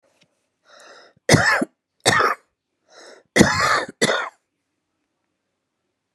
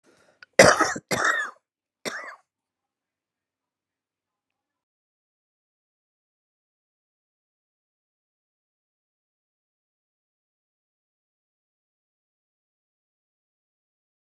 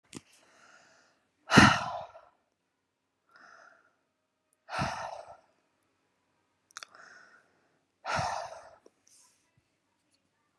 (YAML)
three_cough_length: 6.1 s
three_cough_amplitude: 32767
three_cough_signal_mean_std_ratio: 0.37
cough_length: 14.3 s
cough_amplitude: 31751
cough_signal_mean_std_ratio: 0.15
exhalation_length: 10.6 s
exhalation_amplitude: 22901
exhalation_signal_mean_std_ratio: 0.21
survey_phase: beta (2021-08-13 to 2022-03-07)
age: 45-64
gender: Female
wearing_mask: 'Yes'
symptom_none: true
smoker_status: Ex-smoker
respiratory_condition_asthma: false
respiratory_condition_other: true
recruitment_source: REACT
submission_delay: 1 day
covid_test_result: Negative
covid_test_method: RT-qPCR